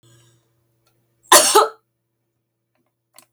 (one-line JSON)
{"cough_length": "3.3 s", "cough_amplitude": 32768, "cough_signal_mean_std_ratio": 0.25, "survey_phase": "beta (2021-08-13 to 2022-03-07)", "age": "65+", "gender": "Female", "wearing_mask": "No", "symptom_none": true, "smoker_status": "Ex-smoker", "respiratory_condition_asthma": false, "respiratory_condition_other": false, "recruitment_source": "REACT", "submission_delay": "4 days", "covid_test_result": "Negative", "covid_test_method": "RT-qPCR"}